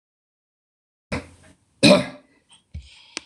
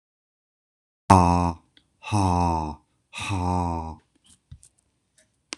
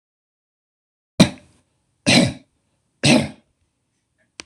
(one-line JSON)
{"cough_length": "3.3 s", "cough_amplitude": 26028, "cough_signal_mean_std_ratio": 0.23, "exhalation_length": "5.6 s", "exhalation_amplitude": 26028, "exhalation_signal_mean_std_ratio": 0.39, "three_cough_length": "4.5 s", "three_cough_amplitude": 26028, "three_cough_signal_mean_std_ratio": 0.28, "survey_phase": "beta (2021-08-13 to 2022-03-07)", "age": "45-64", "gender": "Male", "wearing_mask": "No", "symptom_none": true, "smoker_status": "Never smoked", "respiratory_condition_asthma": false, "respiratory_condition_other": false, "recruitment_source": "REACT", "submission_delay": "1 day", "covid_test_result": "Negative", "covid_test_method": "RT-qPCR"}